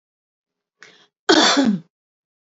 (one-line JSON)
{"cough_length": "2.6 s", "cough_amplitude": 28137, "cough_signal_mean_std_ratio": 0.36, "survey_phase": "alpha (2021-03-01 to 2021-08-12)", "age": "45-64", "gender": "Female", "wearing_mask": "No", "symptom_none": true, "smoker_status": "Ex-smoker", "respiratory_condition_asthma": false, "respiratory_condition_other": false, "recruitment_source": "REACT", "submission_delay": "4 days", "covid_test_result": "Negative", "covid_test_method": "RT-qPCR"}